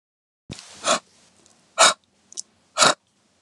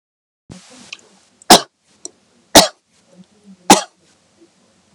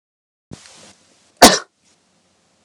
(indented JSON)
{
  "exhalation_length": "3.4 s",
  "exhalation_amplitude": 32364,
  "exhalation_signal_mean_std_ratio": 0.28,
  "three_cough_length": "4.9 s",
  "three_cough_amplitude": 32768,
  "three_cough_signal_mean_std_ratio": 0.21,
  "cough_length": "2.6 s",
  "cough_amplitude": 32768,
  "cough_signal_mean_std_ratio": 0.19,
  "survey_phase": "beta (2021-08-13 to 2022-03-07)",
  "age": "18-44",
  "gender": "Female",
  "wearing_mask": "No",
  "symptom_none": true,
  "smoker_status": "Never smoked",
  "respiratory_condition_asthma": false,
  "respiratory_condition_other": false,
  "recruitment_source": "REACT",
  "submission_delay": "2 days",
  "covid_test_result": "Negative",
  "covid_test_method": "RT-qPCR"
}